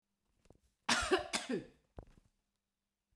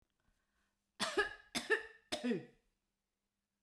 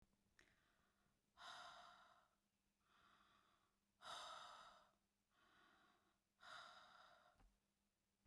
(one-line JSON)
{"cough_length": "3.2 s", "cough_amplitude": 4617, "cough_signal_mean_std_ratio": 0.34, "three_cough_length": "3.6 s", "three_cough_amplitude": 2800, "three_cough_signal_mean_std_ratio": 0.36, "exhalation_length": "8.3 s", "exhalation_amplitude": 207, "exhalation_signal_mean_std_ratio": 0.51, "survey_phase": "beta (2021-08-13 to 2022-03-07)", "age": "45-64", "gender": "Female", "wearing_mask": "No", "symptom_none": true, "smoker_status": "Never smoked", "respiratory_condition_asthma": false, "respiratory_condition_other": false, "recruitment_source": "REACT", "submission_delay": "1 day", "covid_test_result": "Negative", "covid_test_method": "RT-qPCR", "influenza_a_test_result": "Negative", "influenza_b_test_result": "Negative"}